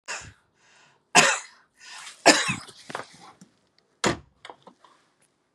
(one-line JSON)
{"three_cough_length": "5.5 s", "three_cough_amplitude": 31577, "three_cough_signal_mean_std_ratio": 0.28, "survey_phase": "beta (2021-08-13 to 2022-03-07)", "age": "45-64", "gender": "Female", "wearing_mask": "No", "symptom_none": true, "smoker_status": "Ex-smoker", "respiratory_condition_asthma": false, "respiratory_condition_other": false, "recruitment_source": "REACT", "submission_delay": "7 days", "covid_test_result": "Negative", "covid_test_method": "RT-qPCR", "influenza_a_test_result": "Negative", "influenza_b_test_result": "Negative"}